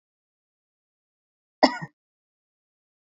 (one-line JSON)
{"cough_length": "3.1 s", "cough_amplitude": 27281, "cough_signal_mean_std_ratio": 0.13, "survey_phase": "beta (2021-08-13 to 2022-03-07)", "age": "45-64", "gender": "Female", "wearing_mask": "No", "symptom_none": true, "smoker_status": "Never smoked", "respiratory_condition_asthma": false, "respiratory_condition_other": true, "recruitment_source": "REACT", "submission_delay": "1 day", "covid_test_result": "Negative", "covid_test_method": "RT-qPCR", "influenza_a_test_result": "Negative", "influenza_b_test_result": "Negative"}